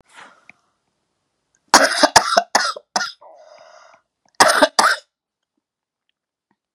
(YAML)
cough_length: 6.7 s
cough_amplitude: 32768
cough_signal_mean_std_ratio: 0.31
survey_phase: beta (2021-08-13 to 2022-03-07)
age: 65+
gender: Female
wearing_mask: 'No'
symptom_cough_any: true
symptom_runny_or_blocked_nose: true
symptom_sore_throat: true
symptom_fatigue: true
symptom_onset: 12 days
smoker_status: Never smoked
respiratory_condition_asthma: false
respiratory_condition_other: false
recruitment_source: REACT
submission_delay: 1 day
covid_test_result: Negative
covid_test_method: RT-qPCR
influenza_a_test_result: Negative
influenza_b_test_result: Negative